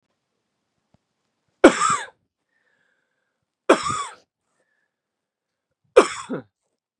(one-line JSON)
{"three_cough_length": "7.0 s", "three_cough_amplitude": 32767, "three_cough_signal_mean_std_ratio": 0.22, "survey_phase": "beta (2021-08-13 to 2022-03-07)", "age": "18-44", "gender": "Male", "wearing_mask": "No", "symptom_cough_any": true, "symptom_runny_or_blocked_nose": true, "symptom_sore_throat": true, "symptom_onset": "3 days", "smoker_status": "Never smoked", "respiratory_condition_asthma": false, "respiratory_condition_other": false, "recruitment_source": "Test and Trace", "submission_delay": "2 days", "covid_test_result": "Positive", "covid_test_method": "RT-qPCR", "covid_ct_value": 27.9, "covid_ct_gene": "ORF1ab gene", "covid_ct_mean": 28.9, "covid_viral_load": "340 copies/ml", "covid_viral_load_category": "Minimal viral load (< 10K copies/ml)"}